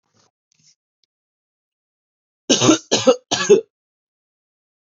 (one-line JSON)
{"three_cough_length": "4.9 s", "three_cough_amplitude": 32440, "three_cough_signal_mean_std_ratio": 0.28, "survey_phase": "beta (2021-08-13 to 2022-03-07)", "age": "18-44", "gender": "Male", "wearing_mask": "No", "symptom_none": true, "smoker_status": "Ex-smoker", "respiratory_condition_asthma": false, "respiratory_condition_other": false, "recruitment_source": "REACT", "submission_delay": "2 days", "covid_test_result": "Negative", "covid_test_method": "RT-qPCR", "influenza_a_test_result": "Negative", "influenza_b_test_result": "Negative"}